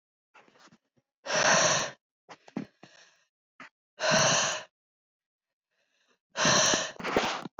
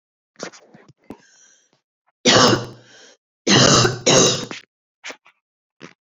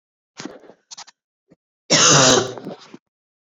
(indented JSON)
{
  "exhalation_length": "7.6 s",
  "exhalation_amplitude": 9703,
  "exhalation_signal_mean_std_ratio": 0.44,
  "three_cough_length": "6.1 s",
  "three_cough_amplitude": 29929,
  "three_cough_signal_mean_std_ratio": 0.38,
  "cough_length": "3.6 s",
  "cough_amplitude": 32768,
  "cough_signal_mean_std_ratio": 0.35,
  "survey_phase": "beta (2021-08-13 to 2022-03-07)",
  "age": "18-44",
  "gender": "Female",
  "wearing_mask": "No",
  "symptom_cough_any": true,
  "symptom_runny_or_blocked_nose": true,
  "symptom_sore_throat": true,
  "symptom_fatigue": true,
  "smoker_status": "Never smoked",
  "respiratory_condition_asthma": false,
  "respiratory_condition_other": false,
  "recruitment_source": "Test and Trace",
  "submission_delay": "2 days",
  "covid_test_result": "Positive",
  "covid_test_method": "RT-qPCR",
  "covid_ct_value": 30.8,
  "covid_ct_gene": "ORF1ab gene",
  "covid_ct_mean": 32.4,
  "covid_viral_load": "24 copies/ml",
  "covid_viral_load_category": "Minimal viral load (< 10K copies/ml)"
}